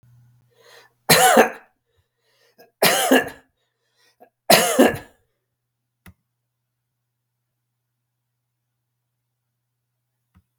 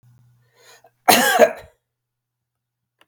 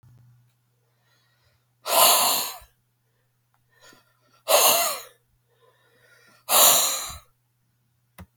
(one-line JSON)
{"three_cough_length": "10.6 s", "three_cough_amplitude": 32768, "three_cough_signal_mean_std_ratio": 0.26, "cough_length": "3.1 s", "cough_amplitude": 32767, "cough_signal_mean_std_ratio": 0.29, "exhalation_length": "8.4 s", "exhalation_amplitude": 28875, "exhalation_signal_mean_std_ratio": 0.35, "survey_phase": "beta (2021-08-13 to 2022-03-07)", "age": "45-64", "gender": "Male", "wearing_mask": "No", "symptom_none": true, "smoker_status": "Never smoked", "respiratory_condition_asthma": false, "respiratory_condition_other": false, "recruitment_source": "REACT", "submission_delay": "1 day", "covid_test_result": "Negative", "covid_test_method": "RT-qPCR", "influenza_a_test_result": "Negative", "influenza_b_test_result": "Negative"}